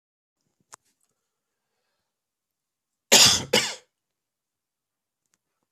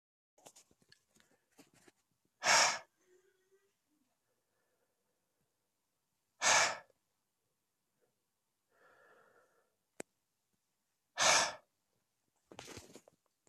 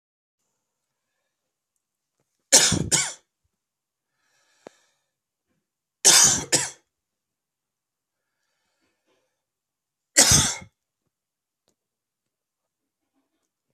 {"cough_length": "5.7 s", "cough_amplitude": 26639, "cough_signal_mean_std_ratio": 0.21, "exhalation_length": "13.5 s", "exhalation_amplitude": 7701, "exhalation_signal_mean_std_ratio": 0.22, "three_cough_length": "13.7 s", "three_cough_amplitude": 32768, "three_cough_signal_mean_std_ratio": 0.23, "survey_phase": "beta (2021-08-13 to 2022-03-07)", "age": "45-64", "gender": "Male", "wearing_mask": "No", "symptom_cough_any": true, "symptom_runny_or_blocked_nose": true, "symptom_sore_throat": true, "symptom_fatigue": true, "symptom_fever_high_temperature": true, "symptom_change_to_sense_of_smell_or_taste": true, "symptom_other": true, "symptom_onset": "4 days", "smoker_status": "Ex-smoker", "respiratory_condition_asthma": false, "respiratory_condition_other": true, "recruitment_source": "Test and Trace", "submission_delay": "2 days", "covid_test_result": "Positive", "covid_test_method": "RT-qPCR", "covid_ct_value": 17.7, "covid_ct_gene": "ORF1ab gene", "covid_ct_mean": 17.9, "covid_viral_load": "1300000 copies/ml", "covid_viral_load_category": "High viral load (>1M copies/ml)"}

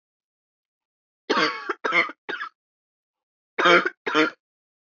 {"cough_length": "4.9 s", "cough_amplitude": 21103, "cough_signal_mean_std_ratio": 0.37, "survey_phase": "beta (2021-08-13 to 2022-03-07)", "age": "18-44", "gender": "Female", "wearing_mask": "No", "symptom_cough_any": true, "symptom_new_continuous_cough": true, "symptom_sore_throat": true, "smoker_status": "Never smoked", "respiratory_condition_asthma": false, "respiratory_condition_other": false, "recruitment_source": "Test and Trace", "submission_delay": "2 days", "covid_test_result": "Positive", "covid_test_method": "LFT"}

